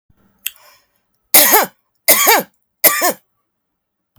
{"three_cough_length": "4.2 s", "three_cough_amplitude": 32768, "three_cough_signal_mean_std_ratio": 0.37, "survey_phase": "beta (2021-08-13 to 2022-03-07)", "age": "45-64", "gender": "Female", "wearing_mask": "No", "symptom_runny_or_blocked_nose": true, "symptom_sore_throat": true, "symptom_fatigue": true, "smoker_status": "Current smoker (11 or more cigarettes per day)", "respiratory_condition_asthma": false, "respiratory_condition_other": false, "recruitment_source": "REACT", "submission_delay": "3 days", "covid_test_result": "Negative", "covid_test_method": "RT-qPCR"}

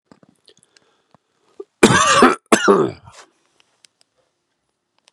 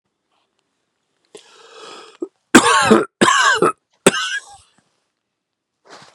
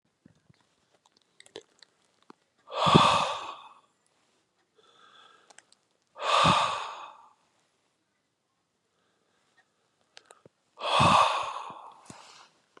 {"cough_length": "5.1 s", "cough_amplitude": 32768, "cough_signal_mean_std_ratio": 0.32, "three_cough_length": "6.1 s", "three_cough_amplitude": 32768, "three_cough_signal_mean_std_ratio": 0.35, "exhalation_length": "12.8 s", "exhalation_amplitude": 25549, "exhalation_signal_mean_std_ratio": 0.32, "survey_phase": "beta (2021-08-13 to 2022-03-07)", "age": "18-44", "gender": "Male", "wearing_mask": "No", "symptom_none": true, "smoker_status": "Never smoked", "respiratory_condition_asthma": false, "respiratory_condition_other": false, "recruitment_source": "REACT", "submission_delay": "4 days", "covid_test_result": "Negative", "covid_test_method": "RT-qPCR", "influenza_a_test_result": "Negative", "influenza_b_test_result": "Negative"}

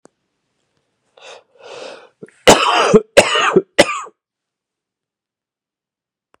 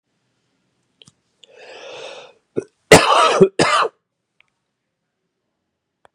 {"three_cough_length": "6.4 s", "three_cough_amplitude": 32768, "three_cough_signal_mean_std_ratio": 0.31, "cough_length": "6.1 s", "cough_amplitude": 32768, "cough_signal_mean_std_ratio": 0.29, "survey_phase": "beta (2021-08-13 to 2022-03-07)", "age": "18-44", "gender": "Male", "wearing_mask": "No", "symptom_runny_or_blocked_nose": true, "symptom_change_to_sense_of_smell_or_taste": true, "symptom_onset": "4 days", "smoker_status": "Never smoked", "respiratory_condition_asthma": false, "respiratory_condition_other": false, "recruitment_source": "Test and Trace", "submission_delay": "2 days", "covid_test_result": "Positive", "covid_test_method": "RT-qPCR", "covid_ct_value": 27.3, "covid_ct_gene": "N gene"}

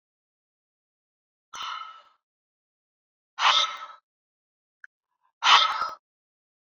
{"exhalation_length": "6.7 s", "exhalation_amplitude": 22011, "exhalation_signal_mean_std_ratio": 0.27, "survey_phase": "alpha (2021-03-01 to 2021-08-12)", "age": "45-64", "gender": "Female", "wearing_mask": "No", "symptom_none": true, "symptom_onset": "12 days", "smoker_status": "Ex-smoker", "respiratory_condition_asthma": false, "respiratory_condition_other": false, "recruitment_source": "REACT", "submission_delay": "4 days", "covid_test_result": "Negative", "covid_test_method": "RT-qPCR"}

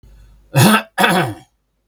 {"cough_length": "1.9 s", "cough_amplitude": 32768, "cough_signal_mean_std_ratio": 0.48, "survey_phase": "beta (2021-08-13 to 2022-03-07)", "age": "65+", "gender": "Male", "wearing_mask": "No", "symptom_none": true, "smoker_status": "Never smoked", "respiratory_condition_asthma": false, "respiratory_condition_other": true, "recruitment_source": "REACT", "submission_delay": "2 days", "covid_test_result": "Negative", "covid_test_method": "RT-qPCR", "influenza_a_test_result": "Negative", "influenza_b_test_result": "Negative"}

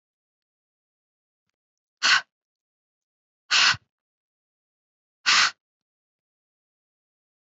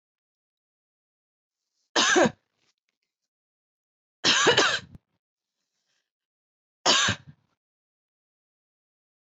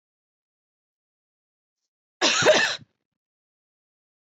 {"exhalation_length": "7.4 s", "exhalation_amplitude": 15836, "exhalation_signal_mean_std_ratio": 0.23, "three_cough_length": "9.3 s", "three_cough_amplitude": 14344, "three_cough_signal_mean_std_ratio": 0.28, "cough_length": "4.4 s", "cough_amplitude": 15412, "cough_signal_mean_std_ratio": 0.27, "survey_phase": "beta (2021-08-13 to 2022-03-07)", "age": "18-44", "gender": "Female", "wearing_mask": "No", "symptom_none": true, "smoker_status": "Never smoked", "respiratory_condition_asthma": false, "respiratory_condition_other": false, "recruitment_source": "REACT", "submission_delay": "1 day", "covid_test_result": "Negative", "covid_test_method": "RT-qPCR", "influenza_a_test_result": "Negative", "influenza_b_test_result": "Negative"}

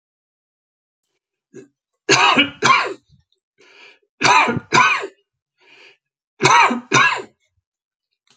{"three_cough_length": "8.4 s", "three_cough_amplitude": 30821, "three_cough_signal_mean_std_ratio": 0.4, "survey_phase": "alpha (2021-03-01 to 2021-08-12)", "age": "65+", "gender": "Male", "wearing_mask": "No", "symptom_none": true, "smoker_status": "Ex-smoker", "respiratory_condition_asthma": false, "respiratory_condition_other": false, "recruitment_source": "REACT", "submission_delay": "2 days", "covid_test_result": "Negative", "covid_test_method": "RT-qPCR"}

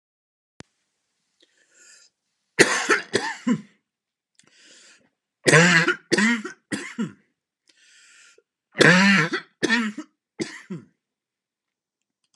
{"three_cough_length": "12.4 s", "three_cough_amplitude": 32697, "three_cough_signal_mean_std_ratio": 0.34, "survey_phase": "alpha (2021-03-01 to 2021-08-12)", "age": "45-64", "gender": "Male", "wearing_mask": "No", "symptom_cough_any": true, "symptom_fatigue": true, "symptom_onset": "2 days", "smoker_status": "Never smoked", "respiratory_condition_asthma": true, "respiratory_condition_other": false, "recruitment_source": "Test and Trace", "submission_delay": "1 day", "covid_test_result": "Positive", "covid_test_method": "RT-qPCR"}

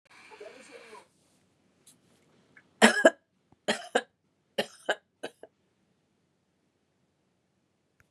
{"three_cough_length": "8.1 s", "three_cough_amplitude": 23632, "three_cough_signal_mean_std_ratio": 0.19, "survey_phase": "beta (2021-08-13 to 2022-03-07)", "age": "45-64", "gender": "Female", "wearing_mask": "No", "symptom_none": true, "smoker_status": "Never smoked", "respiratory_condition_asthma": false, "respiratory_condition_other": false, "recruitment_source": "REACT", "submission_delay": "2 days", "covid_test_result": "Negative", "covid_test_method": "RT-qPCR", "influenza_a_test_result": "Negative", "influenza_b_test_result": "Negative"}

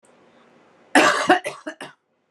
{"cough_length": "2.3 s", "cough_amplitude": 30852, "cough_signal_mean_std_ratio": 0.36, "survey_phase": "beta (2021-08-13 to 2022-03-07)", "age": "18-44", "gender": "Female", "wearing_mask": "No", "symptom_none": true, "smoker_status": "Current smoker (1 to 10 cigarettes per day)", "respiratory_condition_asthma": false, "respiratory_condition_other": false, "recruitment_source": "REACT", "submission_delay": "1 day", "covid_test_result": "Negative", "covid_test_method": "RT-qPCR"}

